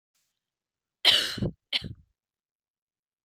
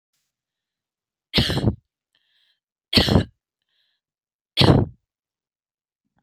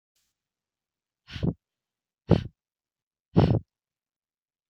cough_length: 3.2 s
cough_amplitude: 16399
cough_signal_mean_std_ratio: 0.28
three_cough_length: 6.2 s
three_cough_amplitude: 26277
three_cough_signal_mean_std_ratio: 0.29
exhalation_length: 4.7 s
exhalation_amplitude: 18733
exhalation_signal_mean_std_ratio: 0.23
survey_phase: beta (2021-08-13 to 2022-03-07)
age: 18-44
gender: Female
wearing_mask: 'No'
symptom_cough_any: true
symptom_runny_or_blocked_nose: true
symptom_onset: 4 days
smoker_status: Never smoked
respiratory_condition_asthma: false
respiratory_condition_other: false
recruitment_source: Test and Trace
submission_delay: 2 days
covid_test_result: Negative
covid_test_method: RT-qPCR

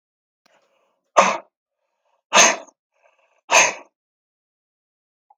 exhalation_length: 5.4 s
exhalation_amplitude: 32768
exhalation_signal_mean_std_ratio: 0.26
survey_phase: beta (2021-08-13 to 2022-03-07)
age: 45-64
gender: Male
wearing_mask: 'No'
symptom_none: true
smoker_status: Never smoked
respiratory_condition_asthma: false
respiratory_condition_other: false
recruitment_source: REACT
submission_delay: 2 days
covid_test_result: Negative
covid_test_method: RT-qPCR
influenza_a_test_result: Negative
influenza_b_test_result: Negative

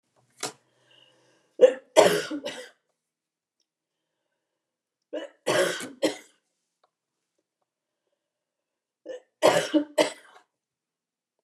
three_cough_length: 11.4 s
three_cough_amplitude: 25311
three_cough_signal_mean_std_ratio: 0.26
survey_phase: beta (2021-08-13 to 2022-03-07)
age: 65+
gender: Female
wearing_mask: 'No'
symptom_none: true
smoker_status: Never smoked
respiratory_condition_asthma: false
respiratory_condition_other: false
recruitment_source: REACT
submission_delay: 0 days
covid_test_result: Negative
covid_test_method: RT-qPCR
influenza_a_test_result: Negative
influenza_b_test_result: Negative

